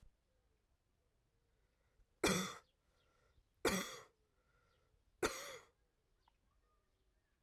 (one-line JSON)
{"three_cough_length": "7.4 s", "three_cough_amplitude": 3111, "three_cough_signal_mean_std_ratio": 0.26, "survey_phase": "alpha (2021-03-01 to 2021-08-12)", "age": "18-44", "gender": "Female", "wearing_mask": "No", "symptom_cough_any": true, "symptom_shortness_of_breath": true, "symptom_headache": true, "smoker_status": "Never smoked", "respiratory_condition_asthma": false, "respiratory_condition_other": false, "recruitment_source": "Test and Trace", "submission_delay": "1 day", "covid_test_result": "Positive", "covid_test_method": "LFT"}